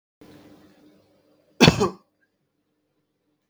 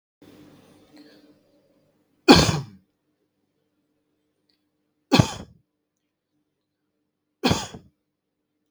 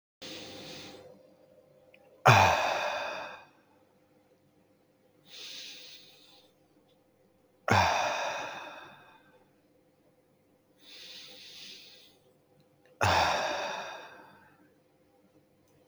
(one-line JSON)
{"cough_length": "3.5 s", "cough_amplitude": 32768, "cough_signal_mean_std_ratio": 0.2, "three_cough_length": "8.7 s", "three_cough_amplitude": 32768, "three_cough_signal_mean_std_ratio": 0.2, "exhalation_length": "15.9 s", "exhalation_amplitude": 17070, "exhalation_signal_mean_std_ratio": 0.34, "survey_phase": "beta (2021-08-13 to 2022-03-07)", "age": "18-44", "gender": "Male", "wearing_mask": "No", "symptom_none": true, "smoker_status": "Never smoked", "respiratory_condition_asthma": false, "respiratory_condition_other": false, "recruitment_source": "REACT", "submission_delay": "3 days", "covid_test_result": "Negative", "covid_test_method": "RT-qPCR", "influenza_a_test_result": "Negative", "influenza_b_test_result": "Negative"}